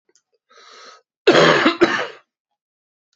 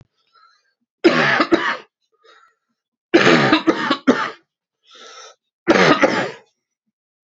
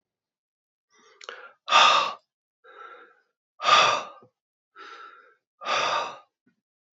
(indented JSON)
{
  "cough_length": "3.2 s",
  "cough_amplitude": 27997,
  "cough_signal_mean_std_ratio": 0.37,
  "three_cough_length": "7.3 s",
  "three_cough_amplitude": 31567,
  "three_cough_signal_mean_std_ratio": 0.43,
  "exhalation_length": "7.0 s",
  "exhalation_amplitude": 21124,
  "exhalation_signal_mean_std_ratio": 0.34,
  "survey_phase": "beta (2021-08-13 to 2022-03-07)",
  "age": "45-64",
  "gender": "Male",
  "wearing_mask": "No",
  "symptom_cough_any": true,
  "symptom_new_continuous_cough": true,
  "symptom_runny_or_blocked_nose": true,
  "symptom_sore_throat": true,
  "symptom_fatigue": true,
  "symptom_fever_high_temperature": true,
  "symptom_headache": true,
  "symptom_change_to_sense_of_smell_or_taste": true,
  "symptom_loss_of_taste": true,
  "symptom_onset": "3 days",
  "smoker_status": "Ex-smoker",
  "respiratory_condition_asthma": false,
  "respiratory_condition_other": false,
  "recruitment_source": "Test and Trace",
  "submission_delay": "1 day",
  "covid_test_result": "Positive",
  "covid_test_method": "RT-qPCR",
  "covid_ct_value": 13.8,
  "covid_ct_gene": "ORF1ab gene",
  "covid_ct_mean": 14.0,
  "covid_viral_load": "26000000 copies/ml",
  "covid_viral_load_category": "High viral load (>1M copies/ml)"
}